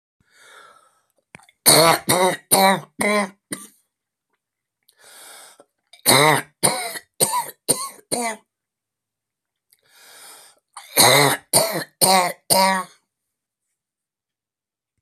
three_cough_length: 15.0 s
three_cough_amplitude: 32768
three_cough_signal_mean_std_ratio: 0.38
survey_phase: beta (2021-08-13 to 2022-03-07)
age: 65+
gender: Male
wearing_mask: 'No'
symptom_new_continuous_cough: true
symptom_runny_or_blocked_nose: true
symptom_shortness_of_breath: true
symptom_sore_throat: true
symptom_fatigue: true
symptom_fever_high_temperature: true
symptom_headache: true
symptom_change_to_sense_of_smell_or_taste: true
symptom_loss_of_taste: true
symptom_onset: 4 days
smoker_status: Never smoked
respiratory_condition_asthma: false
respiratory_condition_other: false
recruitment_source: Test and Trace
submission_delay: 2 days
covid_test_result: Positive
covid_test_method: RT-qPCR
covid_ct_value: 15.8
covid_ct_gene: N gene
covid_ct_mean: 16.9
covid_viral_load: 2800000 copies/ml
covid_viral_load_category: High viral load (>1M copies/ml)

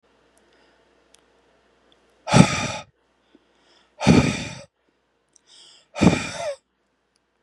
exhalation_length: 7.4 s
exhalation_amplitude: 32768
exhalation_signal_mean_std_ratio: 0.28
survey_phase: beta (2021-08-13 to 2022-03-07)
age: 18-44
gender: Male
wearing_mask: 'No'
symptom_runny_or_blocked_nose: true
symptom_fatigue: true
symptom_onset: 5 days
smoker_status: Current smoker (11 or more cigarettes per day)
respiratory_condition_asthma: true
respiratory_condition_other: false
recruitment_source: REACT
submission_delay: 2 days
covid_test_result: Negative
covid_test_method: RT-qPCR
influenza_a_test_result: Negative
influenza_b_test_result: Negative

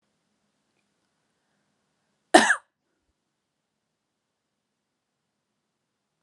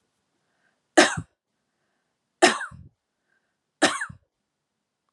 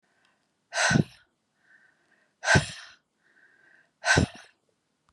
cough_length: 6.2 s
cough_amplitude: 32300
cough_signal_mean_std_ratio: 0.13
three_cough_length: 5.1 s
three_cough_amplitude: 29874
three_cough_signal_mean_std_ratio: 0.23
exhalation_length: 5.1 s
exhalation_amplitude: 15560
exhalation_signal_mean_std_ratio: 0.3
survey_phase: alpha (2021-03-01 to 2021-08-12)
age: 45-64
gender: Female
wearing_mask: 'No'
symptom_none: true
smoker_status: Ex-smoker
respiratory_condition_asthma: false
respiratory_condition_other: false
recruitment_source: REACT
submission_delay: 1 day
covid_test_result: Negative
covid_test_method: RT-qPCR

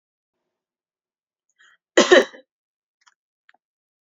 cough_length: 4.1 s
cough_amplitude: 29001
cough_signal_mean_std_ratio: 0.18
survey_phase: beta (2021-08-13 to 2022-03-07)
age: 18-44
gender: Female
wearing_mask: 'No'
symptom_none: true
smoker_status: Never smoked
respiratory_condition_asthma: false
respiratory_condition_other: false
recruitment_source: REACT
submission_delay: 2 days
covid_test_result: Negative
covid_test_method: RT-qPCR
influenza_a_test_result: Negative
influenza_b_test_result: Negative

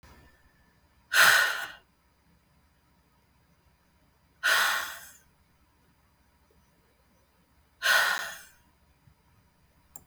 exhalation_length: 10.1 s
exhalation_amplitude: 16566
exhalation_signal_mean_std_ratio: 0.3
survey_phase: beta (2021-08-13 to 2022-03-07)
age: 18-44
gender: Female
wearing_mask: 'No'
symptom_cough_any: true
symptom_new_continuous_cough: true
symptom_fatigue: true
symptom_fever_high_temperature: true
symptom_headache: true
symptom_change_to_sense_of_smell_or_taste: true
symptom_onset: 9 days
smoker_status: Never smoked
respiratory_condition_asthma: false
respiratory_condition_other: false
recruitment_source: Test and Trace
submission_delay: 1 day
covid_test_result: Positive
covid_test_method: RT-qPCR
covid_ct_value: 11.4
covid_ct_gene: ORF1ab gene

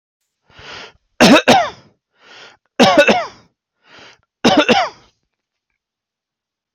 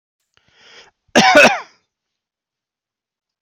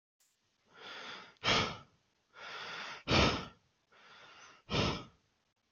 three_cough_length: 6.7 s
three_cough_amplitude: 32768
three_cough_signal_mean_std_ratio: 0.36
cough_length: 3.4 s
cough_amplitude: 31568
cough_signal_mean_std_ratio: 0.29
exhalation_length: 5.7 s
exhalation_amplitude: 5378
exhalation_signal_mean_std_ratio: 0.4
survey_phase: beta (2021-08-13 to 2022-03-07)
age: 18-44
gender: Male
wearing_mask: 'No'
symptom_none: true
smoker_status: Never smoked
respiratory_condition_asthma: false
respiratory_condition_other: false
recruitment_source: REACT
submission_delay: 2 days
covid_test_result: Negative
covid_test_method: RT-qPCR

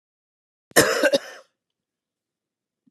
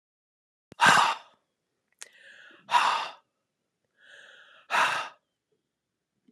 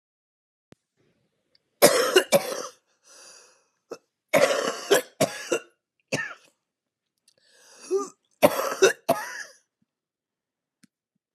cough_length: 2.9 s
cough_amplitude: 29152
cough_signal_mean_std_ratio: 0.28
exhalation_length: 6.3 s
exhalation_amplitude: 18068
exhalation_signal_mean_std_ratio: 0.32
three_cough_length: 11.3 s
three_cough_amplitude: 32043
three_cough_signal_mean_std_ratio: 0.32
survey_phase: beta (2021-08-13 to 2022-03-07)
age: 65+
gender: Female
wearing_mask: 'No'
symptom_cough_any: true
symptom_shortness_of_breath: true
symptom_sore_throat: true
symptom_diarrhoea: true
symptom_fatigue: true
symptom_fever_high_temperature: true
symptom_change_to_sense_of_smell_or_taste: true
symptom_onset: 2 days
smoker_status: Ex-smoker
respiratory_condition_asthma: false
respiratory_condition_other: false
recruitment_source: Test and Trace
submission_delay: 1 day
covid_test_result: Positive
covid_test_method: ePCR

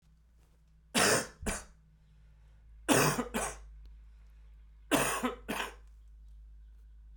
three_cough_length: 7.2 s
three_cough_amplitude: 9472
three_cough_signal_mean_std_ratio: 0.43
survey_phase: beta (2021-08-13 to 2022-03-07)
age: 45-64
gender: Male
wearing_mask: 'No'
symptom_cough_any: true
symptom_runny_or_blocked_nose: true
symptom_sore_throat: true
symptom_fever_high_temperature: true
symptom_headache: true
symptom_onset: 4 days
smoker_status: Never smoked
respiratory_condition_asthma: false
respiratory_condition_other: false
recruitment_source: Test and Trace
submission_delay: 2 days
covid_test_result: Positive
covid_test_method: RT-qPCR
covid_ct_value: 19.3
covid_ct_gene: ORF1ab gene
covid_ct_mean: 19.5
covid_viral_load: 400000 copies/ml
covid_viral_load_category: Low viral load (10K-1M copies/ml)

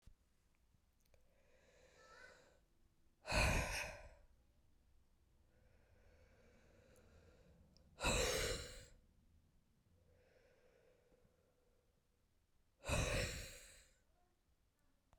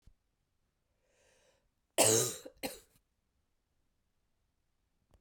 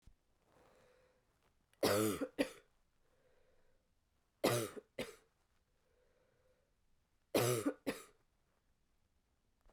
exhalation_length: 15.2 s
exhalation_amplitude: 2220
exhalation_signal_mean_std_ratio: 0.33
cough_length: 5.2 s
cough_amplitude: 8371
cough_signal_mean_std_ratio: 0.22
three_cough_length: 9.7 s
three_cough_amplitude: 3477
three_cough_signal_mean_std_ratio: 0.3
survey_phase: beta (2021-08-13 to 2022-03-07)
age: 18-44
gender: Female
wearing_mask: 'No'
symptom_cough_any: true
symptom_runny_or_blocked_nose: true
symptom_sore_throat: true
symptom_headache: true
symptom_change_to_sense_of_smell_or_taste: true
symptom_loss_of_taste: true
symptom_onset: 3 days
smoker_status: Never smoked
respiratory_condition_asthma: false
respiratory_condition_other: false
recruitment_source: Test and Trace
submission_delay: 2 days
covid_test_result: Positive
covid_test_method: RT-qPCR
covid_ct_value: 14.3
covid_ct_gene: ORF1ab gene
covid_ct_mean: 14.7
covid_viral_load: 15000000 copies/ml
covid_viral_load_category: High viral load (>1M copies/ml)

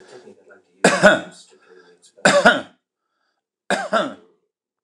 three_cough_length: 4.8 s
three_cough_amplitude: 29204
three_cough_signal_mean_std_ratio: 0.34
survey_phase: beta (2021-08-13 to 2022-03-07)
age: 65+
gender: Male
wearing_mask: 'No'
symptom_none: true
smoker_status: Ex-smoker
respiratory_condition_asthma: false
respiratory_condition_other: false
recruitment_source: REACT
submission_delay: 0 days
covid_test_result: Negative
covid_test_method: RT-qPCR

